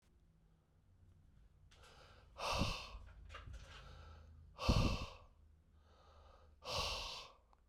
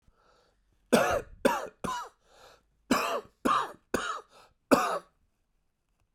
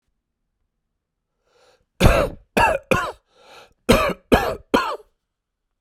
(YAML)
exhalation_length: 7.7 s
exhalation_amplitude: 2768
exhalation_signal_mean_std_ratio: 0.42
three_cough_length: 6.1 s
three_cough_amplitude: 15008
three_cough_signal_mean_std_ratio: 0.4
cough_length: 5.8 s
cough_amplitude: 32767
cough_signal_mean_std_ratio: 0.37
survey_phase: beta (2021-08-13 to 2022-03-07)
age: 45-64
gender: Male
wearing_mask: 'No'
symptom_cough_any: true
symptom_runny_or_blocked_nose: true
symptom_sore_throat: true
symptom_fatigue: true
symptom_onset: 3 days
smoker_status: Never smoked
respiratory_condition_asthma: false
respiratory_condition_other: false
recruitment_source: Test and Trace
submission_delay: 1 day
covid_test_result: Positive
covid_test_method: RT-qPCR
covid_ct_value: 17.0
covid_ct_gene: N gene